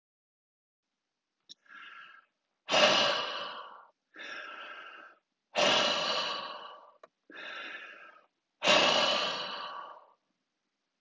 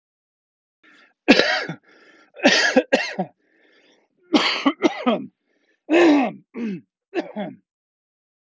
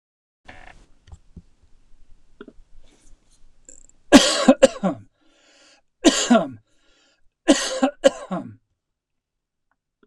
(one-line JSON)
{"exhalation_length": "11.0 s", "exhalation_amplitude": 11948, "exhalation_signal_mean_std_ratio": 0.44, "cough_length": "8.4 s", "cough_amplitude": 26962, "cough_signal_mean_std_ratio": 0.41, "three_cough_length": "10.1 s", "three_cough_amplitude": 26455, "three_cough_signal_mean_std_ratio": 0.28, "survey_phase": "beta (2021-08-13 to 2022-03-07)", "age": "45-64", "gender": "Male", "wearing_mask": "No", "symptom_none": true, "smoker_status": "Ex-smoker", "respiratory_condition_asthma": false, "respiratory_condition_other": false, "recruitment_source": "REACT", "submission_delay": "1 day", "covid_test_result": "Negative", "covid_test_method": "RT-qPCR"}